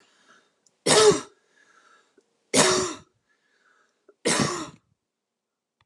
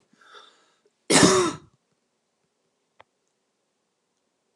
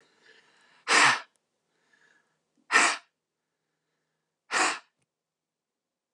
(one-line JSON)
{"three_cough_length": "5.9 s", "three_cough_amplitude": 21583, "three_cough_signal_mean_std_ratio": 0.33, "cough_length": "4.6 s", "cough_amplitude": 27832, "cough_signal_mean_std_ratio": 0.25, "exhalation_length": "6.1 s", "exhalation_amplitude": 14084, "exhalation_signal_mean_std_ratio": 0.28, "survey_phase": "alpha (2021-03-01 to 2021-08-12)", "age": "65+", "gender": "Female", "wearing_mask": "No", "symptom_none": true, "smoker_status": "Ex-smoker", "respiratory_condition_asthma": false, "respiratory_condition_other": false, "recruitment_source": "REACT", "submission_delay": "1 day", "covid_test_result": "Negative", "covid_test_method": "RT-qPCR"}